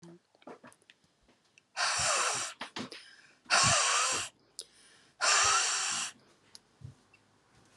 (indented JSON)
{
  "exhalation_length": "7.8 s",
  "exhalation_amplitude": 8164,
  "exhalation_signal_mean_std_ratio": 0.49,
  "survey_phase": "alpha (2021-03-01 to 2021-08-12)",
  "age": "45-64",
  "gender": "Female",
  "wearing_mask": "No",
  "symptom_headache": true,
  "smoker_status": "Ex-smoker",
  "respiratory_condition_asthma": true,
  "respiratory_condition_other": false,
  "recruitment_source": "REACT",
  "submission_delay": "2 days",
  "covid_test_result": "Negative",
  "covid_test_method": "RT-qPCR"
}